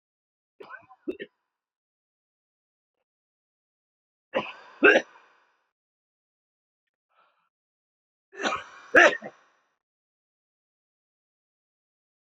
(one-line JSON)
{"three_cough_length": "12.4 s", "three_cough_amplitude": 22257, "three_cough_signal_mean_std_ratio": 0.18, "survey_phase": "beta (2021-08-13 to 2022-03-07)", "age": "18-44", "gender": "Male", "wearing_mask": "No", "symptom_cough_any": true, "symptom_new_continuous_cough": true, "symptom_fatigue": true, "symptom_headache": true, "smoker_status": "Ex-smoker", "respiratory_condition_asthma": false, "respiratory_condition_other": false, "recruitment_source": "Test and Trace", "submission_delay": "1 day", "covid_test_result": "Positive", "covid_test_method": "ePCR"}